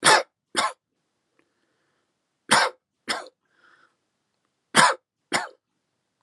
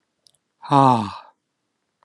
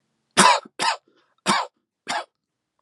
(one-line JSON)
{"three_cough_length": "6.2 s", "three_cough_amplitude": 27823, "three_cough_signal_mean_std_ratio": 0.28, "exhalation_length": "2.0 s", "exhalation_amplitude": 28014, "exhalation_signal_mean_std_ratio": 0.31, "cough_length": "2.8 s", "cough_amplitude": 28189, "cough_signal_mean_std_ratio": 0.36, "survey_phase": "alpha (2021-03-01 to 2021-08-12)", "age": "45-64", "gender": "Male", "wearing_mask": "No", "symptom_abdominal_pain": true, "symptom_diarrhoea": true, "symptom_fatigue": true, "symptom_fever_high_temperature": true, "symptom_headache": true, "symptom_onset": "4 days", "smoker_status": "Ex-smoker", "respiratory_condition_asthma": false, "respiratory_condition_other": false, "recruitment_source": "Test and Trace", "submission_delay": "2 days", "covid_test_result": "Positive", "covid_test_method": "RT-qPCR", "covid_ct_value": 28.0, "covid_ct_gene": "ORF1ab gene"}